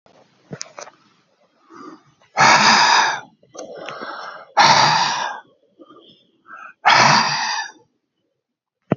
{"exhalation_length": "9.0 s", "exhalation_amplitude": 31397, "exhalation_signal_mean_std_ratio": 0.44, "survey_phase": "beta (2021-08-13 to 2022-03-07)", "age": "65+", "gender": "Male", "wearing_mask": "No", "symptom_none": true, "smoker_status": "Ex-smoker", "respiratory_condition_asthma": false, "respiratory_condition_other": false, "recruitment_source": "REACT", "submission_delay": "2 days", "covid_test_result": "Negative", "covid_test_method": "RT-qPCR", "influenza_a_test_result": "Negative", "influenza_b_test_result": "Negative"}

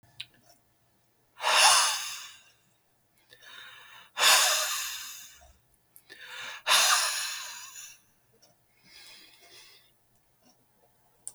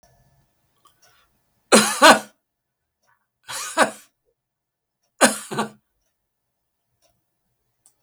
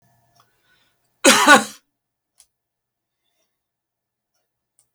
{"exhalation_length": "11.3 s", "exhalation_amplitude": 14128, "exhalation_signal_mean_std_ratio": 0.37, "three_cough_length": "8.0 s", "three_cough_amplitude": 32768, "three_cough_signal_mean_std_ratio": 0.23, "cough_length": "4.9 s", "cough_amplitude": 32768, "cough_signal_mean_std_ratio": 0.21, "survey_phase": "beta (2021-08-13 to 2022-03-07)", "age": "65+", "gender": "Male", "wearing_mask": "No", "symptom_fatigue": true, "smoker_status": "Never smoked", "respiratory_condition_asthma": false, "respiratory_condition_other": false, "recruitment_source": "REACT", "submission_delay": "1 day", "covid_test_result": "Negative", "covid_test_method": "RT-qPCR", "influenza_a_test_result": "Negative", "influenza_b_test_result": "Negative"}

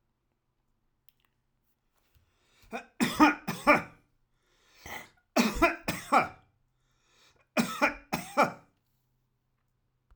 {"three_cough_length": "10.2 s", "three_cough_amplitude": 15033, "three_cough_signal_mean_std_ratio": 0.31, "survey_phase": "alpha (2021-03-01 to 2021-08-12)", "age": "65+", "gender": "Male", "wearing_mask": "No", "symptom_none": true, "smoker_status": "Ex-smoker", "respiratory_condition_asthma": false, "respiratory_condition_other": false, "recruitment_source": "REACT", "submission_delay": "3 days", "covid_test_result": "Negative", "covid_test_method": "RT-qPCR"}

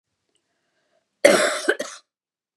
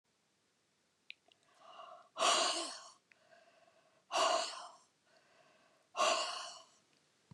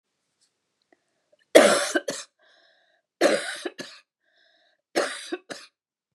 {"cough_length": "2.6 s", "cough_amplitude": 32768, "cough_signal_mean_std_ratio": 0.31, "exhalation_length": "7.3 s", "exhalation_amplitude": 3920, "exhalation_signal_mean_std_ratio": 0.38, "three_cough_length": "6.1 s", "three_cough_amplitude": 32767, "three_cough_signal_mean_std_ratio": 0.29, "survey_phase": "beta (2021-08-13 to 2022-03-07)", "age": "45-64", "gender": "Female", "wearing_mask": "No", "symptom_none": true, "smoker_status": "Never smoked", "respiratory_condition_asthma": false, "respiratory_condition_other": false, "recruitment_source": "REACT", "submission_delay": "1 day", "covid_test_result": "Negative", "covid_test_method": "RT-qPCR", "influenza_a_test_result": "Negative", "influenza_b_test_result": "Negative"}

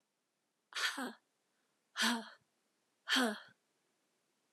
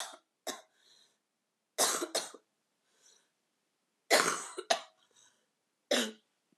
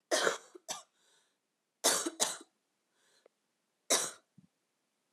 {"exhalation_length": "4.5 s", "exhalation_amplitude": 3588, "exhalation_signal_mean_std_ratio": 0.35, "three_cough_length": "6.6 s", "three_cough_amplitude": 10098, "three_cough_signal_mean_std_ratio": 0.31, "cough_length": "5.1 s", "cough_amplitude": 10402, "cough_signal_mean_std_ratio": 0.32, "survey_phase": "alpha (2021-03-01 to 2021-08-12)", "age": "18-44", "gender": "Female", "wearing_mask": "No", "symptom_cough_any": true, "symptom_new_continuous_cough": true, "symptom_fatigue": true, "symptom_fever_high_temperature": true, "symptom_headache": true, "smoker_status": "Prefer not to say", "respiratory_condition_asthma": false, "respiratory_condition_other": false, "recruitment_source": "Test and Trace", "submission_delay": "2 days", "covid_test_result": "Positive", "covid_test_method": "RT-qPCR"}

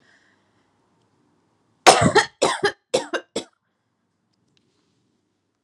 {"three_cough_length": "5.6 s", "three_cough_amplitude": 32768, "three_cough_signal_mean_std_ratio": 0.26, "survey_phase": "alpha (2021-03-01 to 2021-08-12)", "age": "18-44", "gender": "Female", "wearing_mask": "No", "symptom_abdominal_pain": true, "smoker_status": "Ex-smoker", "respiratory_condition_asthma": true, "respiratory_condition_other": false, "recruitment_source": "REACT", "submission_delay": "1 day", "covid_test_result": "Negative", "covid_test_method": "RT-qPCR"}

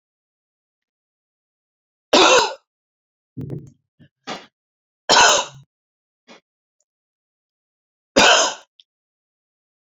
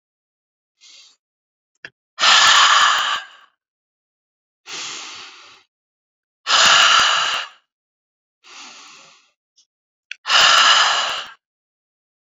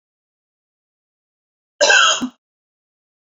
{"three_cough_length": "9.9 s", "three_cough_amplitude": 32768, "three_cough_signal_mean_std_ratio": 0.28, "exhalation_length": "12.4 s", "exhalation_amplitude": 32767, "exhalation_signal_mean_std_ratio": 0.41, "cough_length": "3.3 s", "cough_amplitude": 28226, "cough_signal_mean_std_ratio": 0.29, "survey_phase": "beta (2021-08-13 to 2022-03-07)", "age": "45-64", "gender": "Female", "wearing_mask": "No", "symptom_sore_throat": true, "symptom_headache": true, "smoker_status": "Never smoked", "respiratory_condition_asthma": false, "respiratory_condition_other": false, "recruitment_source": "REACT", "submission_delay": "2 days", "covid_test_result": "Negative", "covid_test_method": "RT-qPCR"}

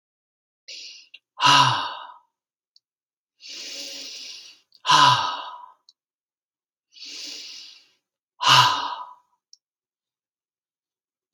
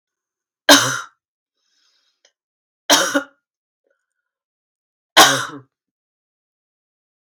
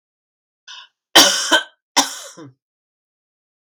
{"exhalation_length": "11.3 s", "exhalation_amplitude": 25479, "exhalation_signal_mean_std_ratio": 0.32, "three_cough_length": "7.2 s", "three_cough_amplitude": 32768, "three_cough_signal_mean_std_ratio": 0.25, "cough_length": "3.7 s", "cough_amplitude": 32749, "cough_signal_mean_std_ratio": 0.3, "survey_phase": "beta (2021-08-13 to 2022-03-07)", "age": "45-64", "gender": "Female", "wearing_mask": "No", "symptom_none": true, "symptom_onset": "12 days", "smoker_status": "Ex-smoker", "respiratory_condition_asthma": false, "respiratory_condition_other": false, "recruitment_source": "REACT", "submission_delay": "1 day", "covid_test_result": "Negative", "covid_test_method": "RT-qPCR", "influenza_a_test_result": "Negative", "influenza_b_test_result": "Negative"}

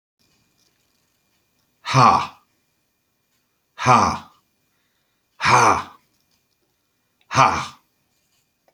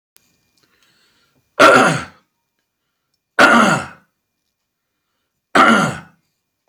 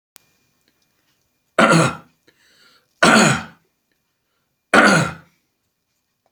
{"exhalation_length": "8.7 s", "exhalation_amplitude": 32461, "exhalation_signal_mean_std_ratio": 0.31, "cough_length": "6.7 s", "cough_amplitude": 32509, "cough_signal_mean_std_ratio": 0.35, "three_cough_length": "6.3 s", "three_cough_amplitude": 32768, "three_cough_signal_mean_std_ratio": 0.34, "survey_phase": "alpha (2021-03-01 to 2021-08-12)", "age": "65+", "gender": "Male", "wearing_mask": "No", "symptom_cough_any": true, "smoker_status": "Ex-smoker", "respiratory_condition_asthma": false, "respiratory_condition_other": false, "recruitment_source": "REACT", "submission_delay": "1 day", "covid_test_result": "Negative", "covid_test_method": "RT-qPCR"}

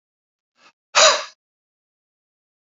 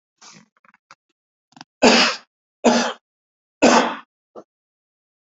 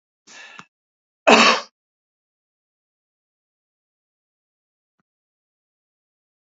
{"exhalation_length": "2.6 s", "exhalation_amplitude": 29719, "exhalation_signal_mean_std_ratio": 0.24, "three_cough_length": "5.4 s", "three_cough_amplitude": 28678, "three_cough_signal_mean_std_ratio": 0.32, "cough_length": "6.6 s", "cough_amplitude": 28778, "cough_signal_mean_std_ratio": 0.17, "survey_phase": "beta (2021-08-13 to 2022-03-07)", "age": "65+", "gender": "Male", "wearing_mask": "No", "symptom_none": true, "smoker_status": "Ex-smoker", "respiratory_condition_asthma": false, "respiratory_condition_other": false, "recruitment_source": "REACT", "submission_delay": "5 days", "covid_test_result": "Negative", "covid_test_method": "RT-qPCR", "influenza_a_test_result": "Negative", "influenza_b_test_result": "Negative"}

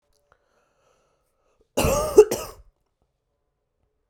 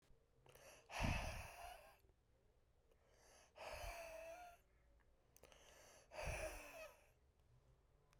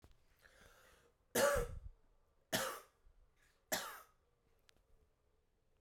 {"cough_length": "4.1 s", "cough_amplitude": 32737, "cough_signal_mean_std_ratio": 0.23, "exhalation_length": "8.2 s", "exhalation_amplitude": 1039, "exhalation_signal_mean_std_ratio": 0.48, "three_cough_length": "5.8 s", "three_cough_amplitude": 2918, "three_cough_signal_mean_std_ratio": 0.32, "survey_phase": "beta (2021-08-13 to 2022-03-07)", "age": "18-44", "gender": "Female", "wearing_mask": "No", "symptom_cough_any": true, "symptom_runny_or_blocked_nose": true, "symptom_sore_throat": true, "symptom_fatigue": true, "symptom_headache": true, "symptom_change_to_sense_of_smell_or_taste": true, "symptom_loss_of_taste": true, "smoker_status": "Current smoker (11 or more cigarettes per day)", "respiratory_condition_asthma": false, "respiratory_condition_other": false, "recruitment_source": "Test and Trace", "submission_delay": "3 days", "covid_test_result": "Positive", "covid_test_method": "RT-qPCR", "covid_ct_value": 28.0, "covid_ct_gene": "ORF1ab gene", "covid_ct_mean": 28.5, "covid_viral_load": "450 copies/ml", "covid_viral_load_category": "Minimal viral load (< 10K copies/ml)"}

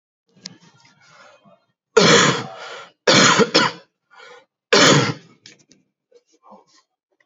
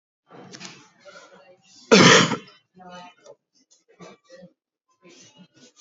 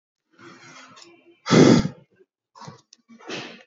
{"three_cough_length": "7.3 s", "three_cough_amplitude": 32119, "three_cough_signal_mean_std_ratio": 0.38, "cough_length": "5.8 s", "cough_amplitude": 30213, "cough_signal_mean_std_ratio": 0.24, "exhalation_length": "3.7 s", "exhalation_amplitude": 25399, "exhalation_signal_mean_std_ratio": 0.29, "survey_phase": "beta (2021-08-13 to 2022-03-07)", "age": "18-44", "gender": "Male", "wearing_mask": "Yes", "symptom_none": true, "smoker_status": "Current smoker (1 to 10 cigarettes per day)", "respiratory_condition_asthma": false, "respiratory_condition_other": false, "recruitment_source": "REACT", "submission_delay": "3 days", "covid_test_result": "Negative", "covid_test_method": "RT-qPCR", "influenza_a_test_result": "Unknown/Void", "influenza_b_test_result": "Unknown/Void"}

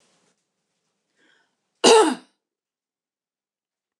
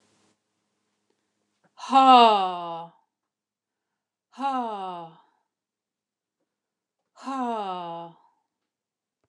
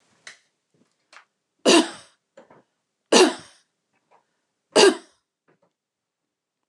{"cough_length": "4.0 s", "cough_amplitude": 26627, "cough_signal_mean_std_ratio": 0.22, "exhalation_length": "9.3 s", "exhalation_amplitude": 25643, "exhalation_signal_mean_std_ratio": 0.29, "three_cough_length": "6.7 s", "three_cough_amplitude": 27740, "three_cough_signal_mean_std_ratio": 0.24, "survey_phase": "beta (2021-08-13 to 2022-03-07)", "age": "45-64", "gender": "Female", "wearing_mask": "No", "symptom_none": true, "smoker_status": "Ex-smoker", "respiratory_condition_asthma": false, "respiratory_condition_other": false, "recruitment_source": "REACT", "submission_delay": "1 day", "covid_test_result": "Negative", "covid_test_method": "RT-qPCR"}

